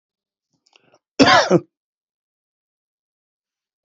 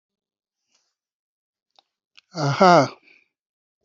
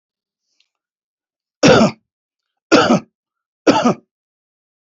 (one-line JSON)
{"cough_length": "3.8 s", "cough_amplitude": 28723, "cough_signal_mean_std_ratio": 0.24, "exhalation_length": "3.8 s", "exhalation_amplitude": 27815, "exhalation_signal_mean_std_ratio": 0.25, "three_cough_length": "4.9 s", "three_cough_amplitude": 30239, "three_cough_signal_mean_std_ratio": 0.33, "survey_phase": "beta (2021-08-13 to 2022-03-07)", "age": "45-64", "gender": "Male", "wearing_mask": "No", "symptom_change_to_sense_of_smell_or_taste": true, "smoker_status": "Never smoked", "respiratory_condition_asthma": false, "respiratory_condition_other": false, "recruitment_source": "REACT", "submission_delay": "4 days", "covid_test_result": "Negative", "covid_test_method": "RT-qPCR"}